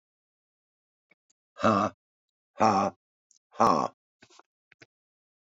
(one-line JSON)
{"exhalation_length": "5.5 s", "exhalation_amplitude": 13107, "exhalation_signal_mean_std_ratio": 0.3, "survey_phase": "beta (2021-08-13 to 2022-03-07)", "age": "65+", "gender": "Male", "wearing_mask": "No", "symptom_runny_or_blocked_nose": true, "symptom_headache": true, "smoker_status": "Ex-smoker", "respiratory_condition_asthma": false, "respiratory_condition_other": false, "recruitment_source": "Test and Trace", "submission_delay": "2 days", "covid_test_result": "Positive", "covid_test_method": "LFT"}